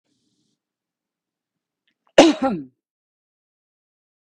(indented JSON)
{
  "cough_length": "4.3 s",
  "cough_amplitude": 32768,
  "cough_signal_mean_std_ratio": 0.19,
  "survey_phase": "beta (2021-08-13 to 2022-03-07)",
  "age": "45-64",
  "gender": "Female",
  "wearing_mask": "No",
  "symptom_none": true,
  "smoker_status": "Ex-smoker",
  "respiratory_condition_asthma": false,
  "respiratory_condition_other": false,
  "recruitment_source": "REACT",
  "submission_delay": "3 days",
  "covid_test_result": "Negative",
  "covid_test_method": "RT-qPCR",
  "influenza_a_test_result": "Negative",
  "influenza_b_test_result": "Negative"
}